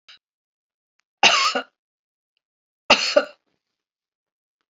{
  "three_cough_length": "4.7 s",
  "three_cough_amplitude": 30424,
  "three_cough_signal_mean_std_ratio": 0.27,
  "survey_phase": "beta (2021-08-13 to 2022-03-07)",
  "age": "65+",
  "gender": "Female",
  "wearing_mask": "No",
  "symptom_cough_any": true,
  "symptom_shortness_of_breath": true,
  "symptom_fatigue": true,
  "symptom_change_to_sense_of_smell_or_taste": true,
  "symptom_loss_of_taste": true,
  "symptom_onset": "9 days",
  "smoker_status": "Never smoked",
  "respiratory_condition_asthma": false,
  "respiratory_condition_other": false,
  "recruitment_source": "Test and Trace",
  "submission_delay": "8 days",
  "covid_test_result": "Positive",
  "covid_test_method": "RT-qPCR",
  "covid_ct_value": 15.4,
  "covid_ct_gene": "ORF1ab gene",
  "covid_ct_mean": 15.6,
  "covid_viral_load": "7600000 copies/ml",
  "covid_viral_load_category": "High viral load (>1M copies/ml)"
}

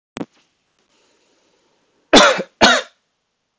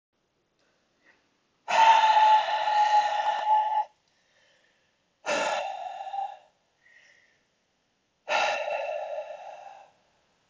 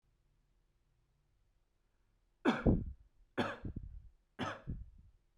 {
  "cough_length": "3.6 s",
  "cough_amplitude": 32766,
  "cough_signal_mean_std_ratio": 0.29,
  "exhalation_length": "10.5 s",
  "exhalation_amplitude": 12692,
  "exhalation_signal_mean_std_ratio": 0.5,
  "three_cough_length": "5.4 s",
  "three_cough_amplitude": 4540,
  "three_cough_signal_mean_std_ratio": 0.33,
  "survey_phase": "beta (2021-08-13 to 2022-03-07)",
  "age": "18-44",
  "gender": "Male",
  "wearing_mask": "No",
  "symptom_none": true,
  "smoker_status": "Never smoked",
  "respiratory_condition_asthma": false,
  "respiratory_condition_other": false,
  "recruitment_source": "REACT",
  "submission_delay": "0 days",
  "covid_test_result": "Negative",
  "covid_test_method": "RT-qPCR"
}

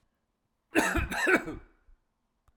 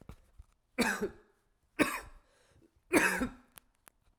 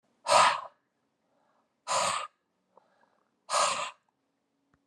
{
  "cough_length": "2.6 s",
  "cough_amplitude": 9826,
  "cough_signal_mean_std_ratio": 0.42,
  "three_cough_length": "4.2 s",
  "three_cough_amplitude": 9921,
  "three_cough_signal_mean_std_ratio": 0.36,
  "exhalation_length": "4.9 s",
  "exhalation_amplitude": 12228,
  "exhalation_signal_mean_std_ratio": 0.35,
  "survey_phase": "alpha (2021-03-01 to 2021-08-12)",
  "age": "45-64",
  "gender": "Male",
  "wearing_mask": "No",
  "symptom_cough_any": true,
  "symptom_new_continuous_cough": true,
  "symptom_fatigue": true,
  "symptom_fever_high_temperature": true,
  "symptom_headache": true,
  "symptom_change_to_sense_of_smell_or_taste": true,
  "symptom_onset": "4 days",
  "smoker_status": "Never smoked",
  "respiratory_condition_asthma": false,
  "respiratory_condition_other": false,
  "recruitment_source": "Test and Trace",
  "submission_delay": "2 days",
  "covid_test_result": "Positive",
  "covid_test_method": "RT-qPCR",
  "covid_ct_value": 29.7,
  "covid_ct_gene": "ORF1ab gene"
}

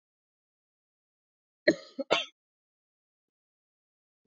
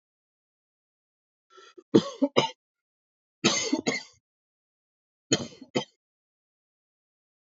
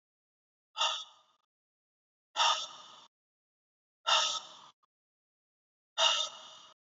{
  "cough_length": "4.3 s",
  "cough_amplitude": 16624,
  "cough_signal_mean_std_ratio": 0.16,
  "three_cough_length": "7.4 s",
  "three_cough_amplitude": 23196,
  "three_cough_signal_mean_std_ratio": 0.25,
  "exhalation_length": "7.0 s",
  "exhalation_amplitude": 6487,
  "exhalation_signal_mean_std_ratio": 0.33,
  "survey_phase": "alpha (2021-03-01 to 2021-08-12)",
  "age": "18-44",
  "gender": "Male",
  "wearing_mask": "No",
  "symptom_none": true,
  "smoker_status": "Never smoked",
  "respiratory_condition_asthma": false,
  "respiratory_condition_other": false,
  "recruitment_source": "REACT",
  "submission_delay": "1 day",
  "covid_test_result": "Negative",
  "covid_test_method": "RT-qPCR"
}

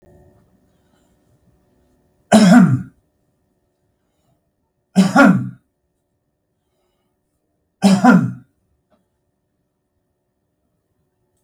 {
  "three_cough_length": "11.4 s",
  "three_cough_amplitude": 32768,
  "three_cough_signal_mean_std_ratio": 0.28,
  "survey_phase": "beta (2021-08-13 to 2022-03-07)",
  "age": "65+",
  "gender": "Male",
  "wearing_mask": "No",
  "symptom_none": true,
  "smoker_status": "Ex-smoker",
  "respiratory_condition_asthma": true,
  "respiratory_condition_other": false,
  "recruitment_source": "REACT",
  "submission_delay": "1 day",
  "covid_test_result": "Negative",
  "covid_test_method": "RT-qPCR",
  "influenza_a_test_result": "Negative",
  "influenza_b_test_result": "Negative"
}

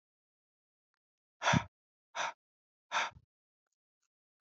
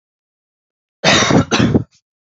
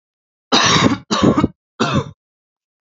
{
  "exhalation_length": "4.5 s",
  "exhalation_amplitude": 5469,
  "exhalation_signal_mean_std_ratio": 0.24,
  "cough_length": "2.2 s",
  "cough_amplitude": 29803,
  "cough_signal_mean_std_ratio": 0.47,
  "three_cough_length": "2.8 s",
  "three_cough_amplitude": 29694,
  "three_cough_signal_mean_std_ratio": 0.51,
  "survey_phase": "alpha (2021-03-01 to 2021-08-12)",
  "age": "18-44",
  "gender": "Male",
  "wearing_mask": "No",
  "symptom_none": true,
  "symptom_onset": "12 days",
  "smoker_status": "Never smoked",
  "respiratory_condition_asthma": false,
  "respiratory_condition_other": false,
  "recruitment_source": "REACT",
  "submission_delay": "2 days",
  "covid_test_result": "Negative",
  "covid_test_method": "RT-qPCR"
}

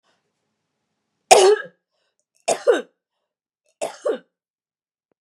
{
  "three_cough_length": "5.2 s",
  "three_cough_amplitude": 32768,
  "three_cough_signal_mean_std_ratio": 0.27,
  "survey_phase": "beta (2021-08-13 to 2022-03-07)",
  "age": "45-64",
  "gender": "Female",
  "wearing_mask": "No",
  "symptom_runny_or_blocked_nose": true,
  "symptom_headache": true,
  "symptom_onset": "4 days",
  "smoker_status": "Ex-smoker",
  "respiratory_condition_asthma": false,
  "respiratory_condition_other": false,
  "recruitment_source": "Test and Trace",
  "submission_delay": "2 days",
  "covid_test_result": "Positive",
  "covid_test_method": "RT-qPCR",
  "covid_ct_value": 23.5,
  "covid_ct_gene": "N gene",
  "covid_ct_mean": 24.5,
  "covid_viral_load": "9000 copies/ml",
  "covid_viral_load_category": "Minimal viral load (< 10K copies/ml)"
}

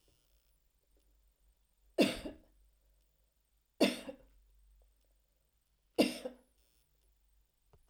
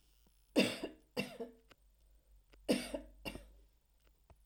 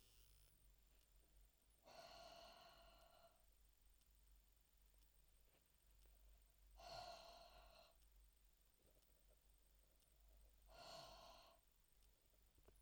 {
  "three_cough_length": "7.9 s",
  "three_cough_amplitude": 6553,
  "three_cough_signal_mean_std_ratio": 0.22,
  "cough_length": "4.5 s",
  "cough_amplitude": 4989,
  "cough_signal_mean_std_ratio": 0.33,
  "exhalation_length": "12.8 s",
  "exhalation_amplitude": 175,
  "exhalation_signal_mean_std_ratio": 0.79,
  "survey_phase": "alpha (2021-03-01 to 2021-08-12)",
  "age": "65+",
  "gender": "Female",
  "wearing_mask": "No",
  "symptom_none": true,
  "smoker_status": "Never smoked",
  "respiratory_condition_asthma": false,
  "respiratory_condition_other": false,
  "recruitment_source": "REACT",
  "submission_delay": "2 days",
  "covid_test_result": "Negative",
  "covid_test_method": "RT-qPCR"
}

